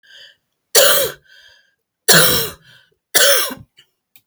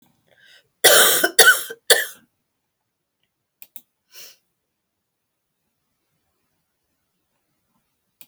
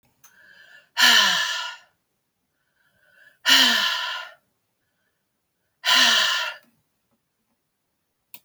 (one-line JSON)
{"three_cough_length": "4.3 s", "three_cough_amplitude": 32768, "three_cough_signal_mean_std_ratio": 0.42, "cough_length": "8.3 s", "cough_amplitude": 32768, "cough_signal_mean_std_ratio": 0.24, "exhalation_length": "8.4 s", "exhalation_amplitude": 22560, "exhalation_signal_mean_std_ratio": 0.39, "survey_phase": "alpha (2021-03-01 to 2021-08-12)", "age": "65+", "gender": "Female", "wearing_mask": "No", "symptom_new_continuous_cough": true, "symptom_diarrhoea": true, "symptom_fatigue": true, "symptom_fever_high_temperature": true, "symptom_headache": true, "symptom_change_to_sense_of_smell_or_taste": true, "symptom_onset": "3 days", "smoker_status": "Ex-smoker", "respiratory_condition_asthma": false, "respiratory_condition_other": false, "recruitment_source": "Test and Trace", "submission_delay": "2 days", "covid_test_result": "Positive", "covid_test_method": "RT-qPCR", "covid_ct_value": 16.6, "covid_ct_gene": "ORF1ab gene", "covid_ct_mean": 17.3, "covid_viral_load": "2200000 copies/ml", "covid_viral_load_category": "High viral load (>1M copies/ml)"}